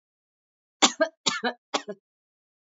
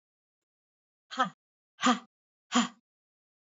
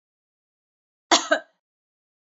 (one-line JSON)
{"three_cough_length": "2.7 s", "three_cough_amplitude": 25082, "three_cough_signal_mean_std_ratio": 0.27, "exhalation_length": "3.6 s", "exhalation_amplitude": 9285, "exhalation_signal_mean_std_ratio": 0.26, "cough_length": "2.3 s", "cough_amplitude": 25090, "cough_signal_mean_std_ratio": 0.21, "survey_phase": "alpha (2021-03-01 to 2021-08-12)", "age": "45-64", "gender": "Female", "wearing_mask": "No", "symptom_none": true, "smoker_status": "Never smoked", "respiratory_condition_asthma": false, "respiratory_condition_other": false, "recruitment_source": "REACT", "submission_delay": "2 days", "covid_test_result": "Negative", "covid_test_method": "RT-qPCR"}